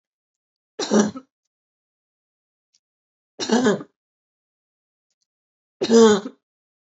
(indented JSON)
{
  "three_cough_length": "6.9 s",
  "three_cough_amplitude": 25997,
  "three_cough_signal_mean_std_ratio": 0.28,
  "survey_phase": "beta (2021-08-13 to 2022-03-07)",
  "age": "18-44",
  "gender": "Female",
  "wearing_mask": "No",
  "symptom_cough_any": true,
  "symptom_sore_throat": true,
  "smoker_status": "Never smoked",
  "respiratory_condition_asthma": false,
  "respiratory_condition_other": false,
  "recruitment_source": "Test and Trace",
  "submission_delay": "0 days",
  "covid_test_result": "Negative",
  "covid_test_method": "LFT"
}